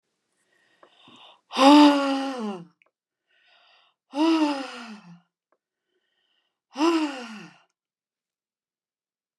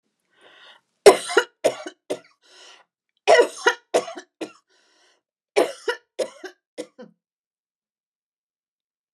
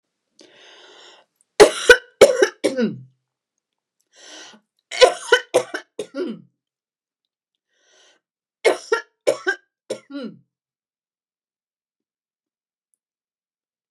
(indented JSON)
{
  "exhalation_length": "9.4 s",
  "exhalation_amplitude": 25788,
  "exhalation_signal_mean_std_ratio": 0.33,
  "cough_length": "9.1 s",
  "cough_amplitude": 29204,
  "cough_signal_mean_std_ratio": 0.24,
  "three_cough_length": "13.9 s",
  "three_cough_amplitude": 29204,
  "three_cough_signal_mean_std_ratio": 0.24,
  "survey_phase": "beta (2021-08-13 to 2022-03-07)",
  "age": "65+",
  "gender": "Female",
  "wearing_mask": "No",
  "symptom_cough_any": true,
  "smoker_status": "Ex-smoker",
  "respiratory_condition_asthma": false,
  "respiratory_condition_other": false,
  "recruitment_source": "REACT",
  "submission_delay": "1 day",
  "covid_test_result": "Negative",
  "covid_test_method": "RT-qPCR",
  "influenza_a_test_result": "Negative",
  "influenza_b_test_result": "Negative"
}